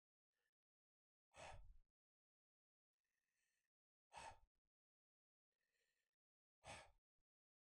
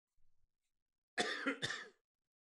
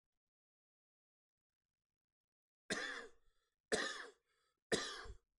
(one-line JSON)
{"exhalation_length": "7.6 s", "exhalation_amplitude": 185, "exhalation_signal_mean_std_ratio": 0.29, "cough_length": "2.4 s", "cough_amplitude": 2901, "cough_signal_mean_std_ratio": 0.39, "three_cough_length": "5.4 s", "three_cough_amplitude": 2411, "three_cough_signal_mean_std_ratio": 0.32, "survey_phase": "beta (2021-08-13 to 2022-03-07)", "age": "18-44", "gender": "Male", "wearing_mask": "No", "symptom_none": true, "smoker_status": "Current smoker (e-cigarettes or vapes only)", "respiratory_condition_asthma": false, "respiratory_condition_other": false, "recruitment_source": "REACT", "submission_delay": "4 days", "covid_test_result": "Negative", "covid_test_method": "RT-qPCR", "influenza_a_test_result": "Negative", "influenza_b_test_result": "Negative"}